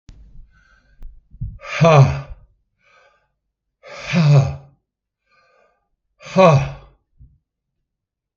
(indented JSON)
{
  "exhalation_length": "8.4 s",
  "exhalation_amplitude": 32766,
  "exhalation_signal_mean_std_ratio": 0.33,
  "survey_phase": "beta (2021-08-13 to 2022-03-07)",
  "age": "65+",
  "gender": "Male",
  "wearing_mask": "No",
  "symptom_headache": true,
  "symptom_onset": "7 days",
  "smoker_status": "Ex-smoker",
  "respiratory_condition_asthma": false,
  "respiratory_condition_other": false,
  "recruitment_source": "REACT",
  "submission_delay": "1 day",
  "covid_test_result": "Negative",
  "covid_test_method": "RT-qPCR",
  "influenza_a_test_result": "Negative",
  "influenza_b_test_result": "Negative"
}